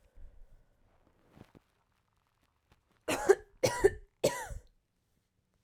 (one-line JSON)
{"three_cough_length": "5.6 s", "three_cough_amplitude": 9324, "three_cough_signal_mean_std_ratio": 0.25, "survey_phase": "alpha (2021-03-01 to 2021-08-12)", "age": "18-44", "gender": "Female", "wearing_mask": "No", "symptom_fever_high_temperature": true, "symptom_headache": true, "symptom_loss_of_taste": true, "symptom_onset": "2 days", "smoker_status": "Never smoked", "respiratory_condition_asthma": false, "respiratory_condition_other": false, "recruitment_source": "Test and Trace", "submission_delay": "2 days", "covid_test_result": "Positive", "covid_test_method": "RT-qPCR", "covid_ct_value": 22.5, "covid_ct_gene": "ORF1ab gene"}